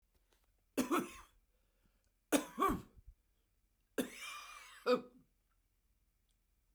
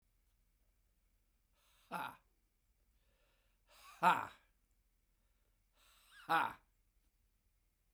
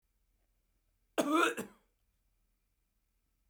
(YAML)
three_cough_length: 6.7 s
three_cough_amplitude: 4669
three_cough_signal_mean_std_ratio: 0.31
exhalation_length: 7.9 s
exhalation_amplitude: 4640
exhalation_signal_mean_std_ratio: 0.21
cough_length: 3.5 s
cough_amplitude: 5522
cough_signal_mean_std_ratio: 0.27
survey_phase: beta (2021-08-13 to 2022-03-07)
age: 65+
gender: Male
wearing_mask: 'No'
symptom_cough_any: true
symptom_runny_or_blocked_nose: true
symptom_shortness_of_breath: true
symptom_onset: 12 days
smoker_status: Ex-smoker
respiratory_condition_asthma: false
respiratory_condition_other: false
recruitment_source: REACT
submission_delay: 2 days
covid_test_result: Negative
covid_test_method: RT-qPCR
influenza_a_test_result: Negative
influenza_b_test_result: Negative